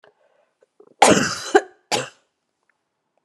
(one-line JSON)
{"cough_length": "3.2 s", "cough_amplitude": 32768, "cough_signal_mean_std_ratio": 0.29, "survey_phase": "beta (2021-08-13 to 2022-03-07)", "age": "45-64", "gender": "Female", "wearing_mask": "No", "symptom_cough_any": true, "symptom_runny_or_blocked_nose": true, "symptom_shortness_of_breath": true, "symptom_fatigue": true, "symptom_headache": true, "symptom_change_to_sense_of_smell_or_taste": true, "symptom_loss_of_taste": true, "symptom_onset": "4 days", "smoker_status": "Never smoked", "respiratory_condition_asthma": false, "respiratory_condition_other": false, "recruitment_source": "Test and Trace", "submission_delay": "1 day", "covid_test_result": "Positive", "covid_test_method": "RT-qPCR", "covid_ct_value": 25.1, "covid_ct_gene": "ORF1ab gene"}